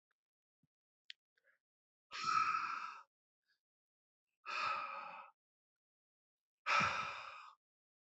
{"exhalation_length": "8.2 s", "exhalation_amplitude": 2576, "exhalation_signal_mean_std_ratio": 0.39, "survey_phase": "alpha (2021-03-01 to 2021-08-12)", "age": "18-44", "gender": "Male", "wearing_mask": "No", "symptom_cough_any": true, "symptom_fever_high_temperature": true, "symptom_headache": true, "symptom_onset": "2 days", "smoker_status": "Never smoked", "respiratory_condition_asthma": false, "respiratory_condition_other": false, "recruitment_source": "Test and Trace", "submission_delay": "1 day", "covid_test_result": "Positive", "covid_test_method": "RT-qPCR", "covid_ct_value": 21.2, "covid_ct_gene": "ORF1ab gene", "covid_ct_mean": 21.7, "covid_viral_load": "77000 copies/ml", "covid_viral_load_category": "Low viral load (10K-1M copies/ml)"}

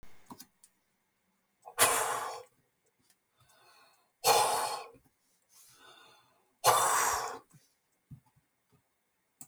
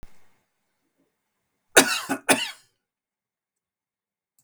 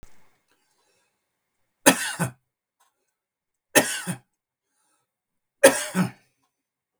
{"exhalation_length": "9.5 s", "exhalation_amplitude": 12135, "exhalation_signal_mean_std_ratio": 0.35, "cough_length": "4.4 s", "cough_amplitude": 32768, "cough_signal_mean_std_ratio": 0.22, "three_cough_length": "7.0 s", "three_cough_amplitude": 32768, "three_cough_signal_mean_std_ratio": 0.23, "survey_phase": "beta (2021-08-13 to 2022-03-07)", "age": "65+", "gender": "Male", "wearing_mask": "No", "symptom_none": true, "smoker_status": "Ex-smoker", "respiratory_condition_asthma": false, "respiratory_condition_other": false, "recruitment_source": "REACT", "submission_delay": "1 day", "covid_test_result": "Negative", "covid_test_method": "RT-qPCR"}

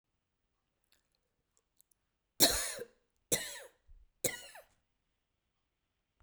{"three_cough_length": "6.2 s", "three_cough_amplitude": 11453, "three_cough_signal_mean_std_ratio": 0.22, "survey_phase": "beta (2021-08-13 to 2022-03-07)", "age": "45-64", "gender": "Female", "wearing_mask": "No", "symptom_none": true, "smoker_status": "Never smoked", "respiratory_condition_asthma": false, "respiratory_condition_other": false, "recruitment_source": "REACT", "submission_delay": "1 day", "covid_test_result": "Negative", "covid_test_method": "RT-qPCR"}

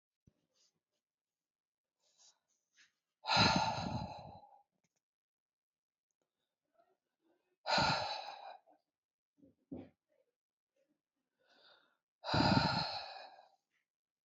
{"exhalation_length": "14.3 s", "exhalation_amplitude": 4801, "exhalation_signal_mean_std_ratio": 0.31, "survey_phase": "beta (2021-08-13 to 2022-03-07)", "age": "65+", "gender": "Female", "wearing_mask": "No", "symptom_none": true, "smoker_status": "Ex-smoker", "respiratory_condition_asthma": false, "respiratory_condition_other": false, "recruitment_source": "REACT", "submission_delay": "2 days", "covid_test_result": "Negative", "covid_test_method": "RT-qPCR", "influenza_a_test_result": "Negative", "influenza_b_test_result": "Negative"}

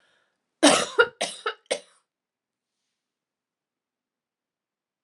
{"cough_length": "5.0 s", "cough_amplitude": 26892, "cough_signal_mean_std_ratio": 0.23, "survey_phase": "alpha (2021-03-01 to 2021-08-12)", "age": "45-64", "gender": "Female", "wearing_mask": "No", "symptom_change_to_sense_of_smell_or_taste": true, "symptom_loss_of_taste": true, "smoker_status": "Never smoked", "respiratory_condition_asthma": false, "respiratory_condition_other": false, "recruitment_source": "Test and Trace", "submission_delay": "2 days", "covid_test_result": "Positive", "covid_test_method": "RT-qPCR"}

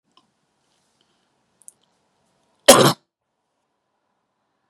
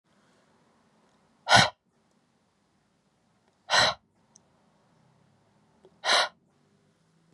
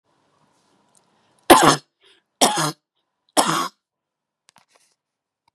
{"cough_length": "4.7 s", "cough_amplitude": 32768, "cough_signal_mean_std_ratio": 0.17, "exhalation_length": "7.3 s", "exhalation_amplitude": 21175, "exhalation_signal_mean_std_ratio": 0.23, "three_cough_length": "5.5 s", "three_cough_amplitude": 32768, "three_cough_signal_mean_std_ratio": 0.27, "survey_phase": "beta (2021-08-13 to 2022-03-07)", "age": "45-64", "gender": "Female", "wearing_mask": "No", "symptom_runny_or_blocked_nose": true, "symptom_sore_throat": true, "symptom_headache": true, "smoker_status": "Never smoked", "respiratory_condition_asthma": false, "respiratory_condition_other": false, "recruitment_source": "Test and Trace", "submission_delay": "2 days", "covid_test_result": "Positive", "covid_test_method": "RT-qPCR", "covid_ct_value": 26.2, "covid_ct_gene": "N gene"}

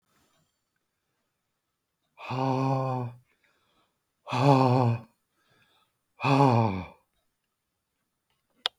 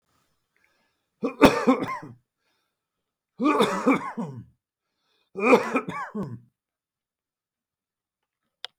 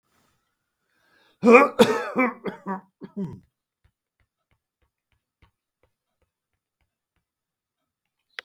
{"exhalation_length": "8.8 s", "exhalation_amplitude": 17454, "exhalation_signal_mean_std_ratio": 0.35, "three_cough_length": "8.8 s", "three_cough_amplitude": 32766, "three_cough_signal_mean_std_ratio": 0.33, "cough_length": "8.4 s", "cough_amplitude": 32627, "cough_signal_mean_std_ratio": 0.22, "survey_phase": "beta (2021-08-13 to 2022-03-07)", "age": "65+", "gender": "Male", "wearing_mask": "No", "symptom_none": true, "smoker_status": "Never smoked", "respiratory_condition_asthma": false, "respiratory_condition_other": false, "recruitment_source": "REACT", "submission_delay": "2 days", "covid_test_result": "Negative", "covid_test_method": "RT-qPCR", "influenza_a_test_result": "Negative", "influenza_b_test_result": "Negative"}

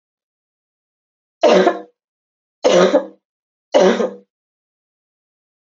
{"three_cough_length": "5.6 s", "three_cough_amplitude": 28280, "three_cough_signal_mean_std_ratio": 0.35, "survey_phase": "beta (2021-08-13 to 2022-03-07)", "age": "45-64", "gender": "Female", "wearing_mask": "No", "symptom_cough_any": true, "smoker_status": "Never smoked", "respiratory_condition_asthma": false, "respiratory_condition_other": false, "recruitment_source": "Test and Trace", "submission_delay": "2 days", "covid_test_result": "Positive", "covid_test_method": "RT-qPCR", "covid_ct_value": 20.0, "covid_ct_gene": "ORF1ab gene", "covid_ct_mean": 20.2, "covid_viral_load": "230000 copies/ml", "covid_viral_load_category": "Low viral load (10K-1M copies/ml)"}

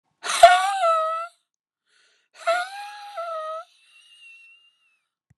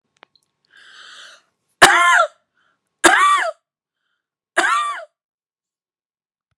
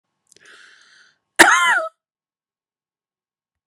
{"exhalation_length": "5.4 s", "exhalation_amplitude": 32768, "exhalation_signal_mean_std_ratio": 0.36, "three_cough_length": "6.6 s", "three_cough_amplitude": 32768, "three_cough_signal_mean_std_ratio": 0.35, "cough_length": "3.7 s", "cough_amplitude": 32768, "cough_signal_mean_std_ratio": 0.27, "survey_phase": "beta (2021-08-13 to 2022-03-07)", "age": "65+", "gender": "Female", "wearing_mask": "Yes", "symptom_shortness_of_breath": true, "smoker_status": "Ex-smoker", "respiratory_condition_asthma": true, "respiratory_condition_other": true, "recruitment_source": "REACT", "submission_delay": "5 days", "covid_test_result": "Negative", "covid_test_method": "RT-qPCR"}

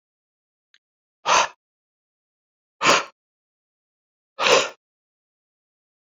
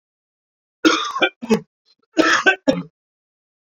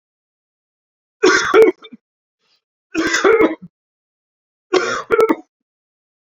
{"exhalation_length": "6.1 s", "exhalation_amplitude": 24944, "exhalation_signal_mean_std_ratio": 0.26, "cough_length": "3.8 s", "cough_amplitude": 30055, "cough_signal_mean_std_ratio": 0.38, "three_cough_length": "6.3 s", "three_cough_amplitude": 30470, "three_cough_signal_mean_std_ratio": 0.38, "survey_phase": "beta (2021-08-13 to 2022-03-07)", "age": "45-64", "gender": "Male", "wearing_mask": "No", "symptom_cough_any": true, "symptom_runny_or_blocked_nose": true, "symptom_fatigue": true, "symptom_headache": true, "symptom_onset": "2 days", "smoker_status": "Never smoked", "respiratory_condition_asthma": false, "respiratory_condition_other": false, "recruitment_source": "Test and Trace", "submission_delay": "2 days", "covid_test_result": "Positive", "covid_test_method": "RT-qPCR"}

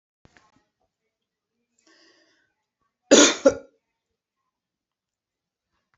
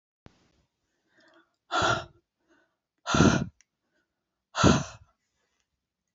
{"cough_length": "6.0 s", "cough_amplitude": 27542, "cough_signal_mean_std_ratio": 0.18, "exhalation_length": "6.1 s", "exhalation_amplitude": 15641, "exhalation_signal_mean_std_ratio": 0.29, "survey_phase": "beta (2021-08-13 to 2022-03-07)", "age": "65+", "gender": "Female", "wearing_mask": "No", "symptom_none": true, "smoker_status": "Never smoked", "respiratory_condition_asthma": false, "respiratory_condition_other": false, "recruitment_source": "REACT", "submission_delay": "1 day", "covid_test_result": "Negative", "covid_test_method": "RT-qPCR"}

